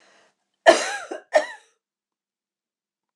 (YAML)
cough_length: 3.2 s
cough_amplitude: 26028
cough_signal_mean_std_ratio: 0.24
survey_phase: beta (2021-08-13 to 2022-03-07)
age: 65+
gender: Female
wearing_mask: 'No'
symptom_none: true
smoker_status: Never smoked
respiratory_condition_asthma: false
respiratory_condition_other: false
recruitment_source: REACT
submission_delay: 0 days
covid_test_result: Negative
covid_test_method: RT-qPCR
influenza_a_test_result: Negative
influenza_b_test_result: Negative